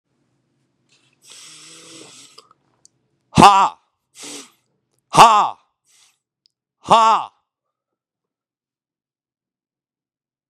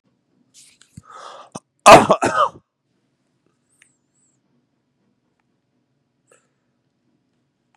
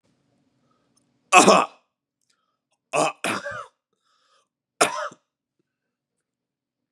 {"exhalation_length": "10.5 s", "exhalation_amplitude": 32768, "exhalation_signal_mean_std_ratio": 0.23, "cough_length": "7.8 s", "cough_amplitude": 32768, "cough_signal_mean_std_ratio": 0.18, "three_cough_length": "6.9 s", "three_cough_amplitude": 32219, "three_cough_signal_mean_std_ratio": 0.25, "survey_phase": "beta (2021-08-13 to 2022-03-07)", "age": "18-44", "gender": "Male", "wearing_mask": "No", "symptom_cough_any": true, "symptom_new_continuous_cough": true, "symptom_runny_or_blocked_nose": true, "symptom_fatigue": true, "symptom_onset": "4 days", "smoker_status": "Never smoked", "respiratory_condition_asthma": false, "respiratory_condition_other": false, "recruitment_source": "Test and Trace", "submission_delay": "1 day", "covid_test_result": "Positive", "covid_test_method": "RT-qPCR", "covid_ct_value": 16.2, "covid_ct_gene": "N gene"}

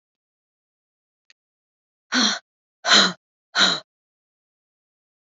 {"exhalation_length": "5.4 s", "exhalation_amplitude": 25302, "exhalation_signal_mean_std_ratio": 0.28, "survey_phase": "beta (2021-08-13 to 2022-03-07)", "age": "45-64", "gender": "Female", "wearing_mask": "No", "symptom_none": true, "smoker_status": "Never smoked", "respiratory_condition_asthma": false, "respiratory_condition_other": false, "recruitment_source": "REACT", "submission_delay": "1 day", "covid_test_result": "Negative", "covid_test_method": "RT-qPCR", "influenza_a_test_result": "Negative", "influenza_b_test_result": "Negative"}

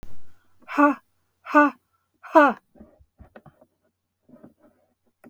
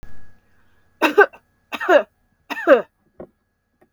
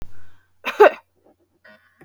{"exhalation_length": "5.3 s", "exhalation_amplitude": 25120, "exhalation_signal_mean_std_ratio": 0.31, "three_cough_length": "3.9 s", "three_cough_amplitude": 32768, "three_cough_signal_mean_std_ratio": 0.33, "cough_length": "2.0 s", "cough_amplitude": 32768, "cough_signal_mean_std_ratio": 0.28, "survey_phase": "beta (2021-08-13 to 2022-03-07)", "age": "65+", "gender": "Female", "wearing_mask": "No", "symptom_none": true, "smoker_status": "Never smoked", "respiratory_condition_asthma": false, "respiratory_condition_other": false, "recruitment_source": "REACT", "submission_delay": "1 day", "covid_test_result": "Negative", "covid_test_method": "RT-qPCR"}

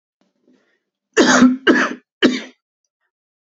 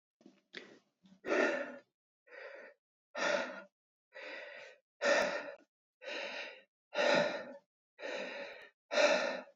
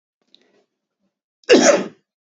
{"three_cough_length": "3.5 s", "three_cough_amplitude": 32768, "three_cough_signal_mean_std_ratio": 0.39, "exhalation_length": "9.6 s", "exhalation_amplitude": 5001, "exhalation_signal_mean_std_ratio": 0.47, "cough_length": "2.4 s", "cough_amplitude": 29074, "cough_signal_mean_std_ratio": 0.3, "survey_phase": "beta (2021-08-13 to 2022-03-07)", "age": "18-44", "gender": "Male", "wearing_mask": "No", "symptom_fatigue": true, "smoker_status": "Ex-smoker", "respiratory_condition_asthma": false, "respiratory_condition_other": false, "recruitment_source": "REACT", "submission_delay": "2 days", "covid_test_result": "Negative", "covid_test_method": "RT-qPCR"}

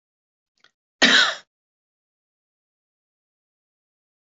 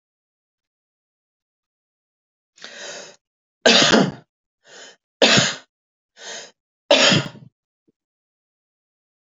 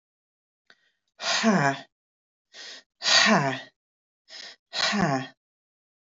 {"cough_length": "4.4 s", "cough_amplitude": 25637, "cough_signal_mean_std_ratio": 0.21, "three_cough_length": "9.4 s", "three_cough_amplitude": 31132, "three_cough_signal_mean_std_ratio": 0.29, "exhalation_length": "6.1 s", "exhalation_amplitude": 16732, "exhalation_signal_mean_std_ratio": 0.42, "survey_phase": "alpha (2021-03-01 to 2021-08-12)", "age": "45-64", "gender": "Female", "wearing_mask": "No", "symptom_none": true, "smoker_status": "Never smoked", "respiratory_condition_asthma": false, "respiratory_condition_other": false, "recruitment_source": "REACT", "submission_delay": "6 days", "covid_test_result": "Negative", "covid_test_method": "RT-qPCR"}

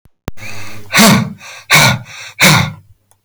{"exhalation_length": "3.2 s", "exhalation_amplitude": 32768, "exhalation_signal_mean_std_ratio": 0.58, "survey_phase": "beta (2021-08-13 to 2022-03-07)", "age": "65+", "gender": "Male", "wearing_mask": "No", "symptom_none": true, "smoker_status": "Ex-smoker", "respiratory_condition_asthma": false, "respiratory_condition_other": true, "recruitment_source": "REACT", "submission_delay": "8 days", "covid_test_result": "Negative", "covid_test_method": "RT-qPCR", "covid_ct_value": 42.0, "covid_ct_gene": "N gene"}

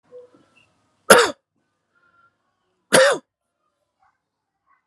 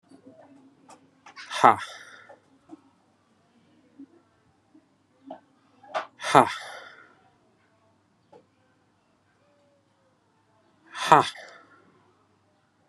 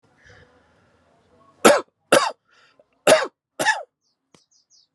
{"cough_length": "4.9 s", "cough_amplitude": 32768, "cough_signal_mean_std_ratio": 0.23, "exhalation_length": "12.9 s", "exhalation_amplitude": 32224, "exhalation_signal_mean_std_ratio": 0.18, "three_cough_length": "4.9 s", "three_cough_amplitude": 32767, "three_cough_signal_mean_std_ratio": 0.28, "survey_phase": "alpha (2021-03-01 to 2021-08-12)", "age": "45-64", "gender": "Male", "wearing_mask": "No", "symptom_cough_any": true, "symptom_fatigue": true, "smoker_status": "Never smoked", "respiratory_condition_asthma": false, "respiratory_condition_other": false, "recruitment_source": "Test and Trace", "submission_delay": "2 days", "covid_test_result": "Positive", "covid_test_method": "RT-qPCR", "covid_ct_value": 19.8, "covid_ct_gene": "ORF1ab gene", "covid_ct_mean": 20.8, "covid_viral_load": "160000 copies/ml", "covid_viral_load_category": "Low viral load (10K-1M copies/ml)"}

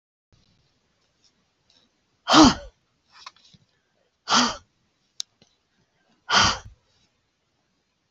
{"exhalation_length": "8.1 s", "exhalation_amplitude": 27360, "exhalation_signal_mean_std_ratio": 0.23, "survey_phase": "beta (2021-08-13 to 2022-03-07)", "age": "65+", "gender": "Female", "wearing_mask": "No", "symptom_runny_or_blocked_nose": true, "symptom_diarrhoea": true, "symptom_headache": true, "symptom_onset": "12 days", "smoker_status": "Ex-smoker", "respiratory_condition_asthma": true, "respiratory_condition_other": false, "recruitment_source": "REACT", "submission_delay": "1 day", "covid_test_result": "Negative", "covid_test_method": "RT-qPCR", "influenza_a_test_result": "Negative", "influenza_b_test_result": "Negative"}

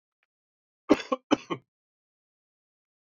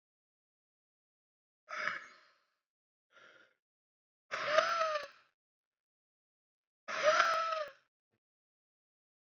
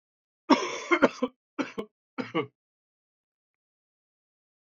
{"cough_length": "3.2 s", "cough_amplitude": 15825, "cough_signal_mean_std_ratio": 0.18, "exhalation_length": "9.2 s", "exhalation_amplitude": 7411, "exhalation_signal_mean_std_ratio": 0.33, "three_cough_length": "4.8 s", "three_cough_amplitude": 16935, "three_cough_signal_mean_std_ratio": 0.27, "survey_phase": "beta (2021-08-13 to 2022-03-07)", "age": "18-44", "gender": "Male", "wearing_mask": "No", "symptom_cough_any": true, "symptom_runny_or_blocked_nose": true, "symptom_fatigue": true, "symptom_headache": true, "symptom_onset": "3 days", "smoker_status": "Prefer not to say", "respiratory_condition_asthma": false, "respiratory_condition_other": false, "recruitment_source": "Test and Trace", "submission_delay": "2 days", "covid_test_result": "Positive", "covid_test_method": "ePCR"}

